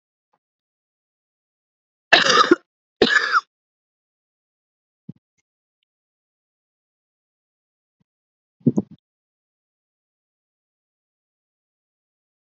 {
  "cough_length": "12.5 s",
  "cough_amplitude": 32768,
  "cough_signal_mean_std_ratio": 0.19,
  "survey_phase": "beta (2021-08-13 to 2022-03-07)",
  "age": "45-64",
  "gender": "Female",
  "wearing_mask": "No",
  "symptom_cough_any": true,
  "symptom_new_continuous_cough": true,
  "symptom_runny_or_blocked_nose": true,
  "symptom_sore_throat": true,
  "symptom_onset": "4 days",
  "smoker_status": "Ex-smoker",
  "respiratory_condition_asthma": false,
  "respiratory_condition_other": false,
  "recruitment_source": "Test and Trace",
  "submission_delay": "2 days",
  "covid_test_result": "Positive",
  "covid_test_method": "RT-qPCR",
  "covid_ct_value": 19.2,
  "covid_ct_gene": "ORF1ab gene"
}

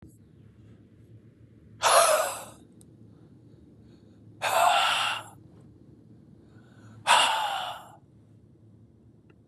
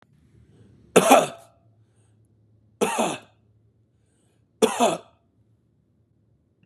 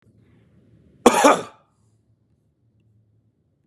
{
  "exhalation_length": "9.5 s",
  "exhalation_amplitude": 15428,
  "exhalation_signal_mean_std_ratio": 0.4,
  "three_cough_length": "6.7 s",
  "three_cough_amplitude": 32416,
  "three_cough_signal_mean_std_ratio": 0.27,
  "cough_length": "3.7 s",
  "cough_amplitude": 32767,
  "cough_signal_mean_std_ratio": 0.22,
  "survey_phase": "beta (2021-08-13 to 2022-03-07)",
  "age": "18-44",
  "gender": "Male",
  "wearing_mask": "No",
  "symptom_none": true,
  "smoker_status": "Ex-smoker",
  "respiratory_condition_asthma": true,
  "respiratory_condition_other": false,
  "recruitment_source": "REACT",
  "submission_delay": "3 days",
  "covid_test_result": "Negative",
  "covid_test_method": "RT-qPCR",
  "influenza_a_test_result": "Unknown/Void",
  "influenza_b_test_result": "Unknown/Void"
}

